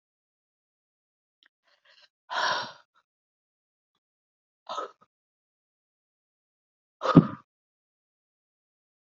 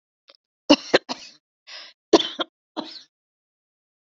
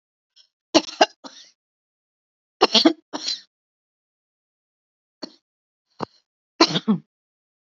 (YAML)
exhalation_length: 9.1 s
exhalation_amplitude: 26193
exhalation_signal_mean_std_ratio: 0.15
cough_length: 4.1 s
cough_amplitude: 30176
cough_signal_mean_std_ratio: 0.21
three_cough_length: 7.7 s
three_cough_amplitude: 28851
three_cough_signal_mean_std_ratio: 0.23
survey_phase: alpha (2021-03-01 to 2021-08-12)
age: 65+
gender: Female
wearing_mask: 'No'
symptom_none: true
smoker_status: Ex-smoker
respiratory_condition_asthma: false
respiratory_condition_other: false
recruitment_source: REACT
submission_delay: 1 day
covid_test_result: Negative
covid_test_method: RT-qPCR